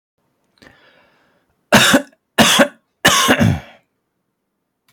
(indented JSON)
{
  "three_cough_length": "4.9 s",
  "three_cough_amplitude": 32768,
  "three_cough_signal_mean_std_ratio": 0.39,
  "survey_phase": "alpha (2021-03-01 to 2021-08-12)",
  "age": "18-44",
  "gender": "Male",
  "wearing_mask": "No",
  "symptom_fatigue": true,
  "symptom_onset": "12 days",
  "smoker_status": "Ex-smoker",
  "respiratory_condition_asthma": false,
  "respiratory_condition_other": false,
  "recruitment_source": "REACT",
  "submission_delay": "3 days",
  "covid_test_result": "Negative",
  "covid_test_method": "RT-qPCR"
}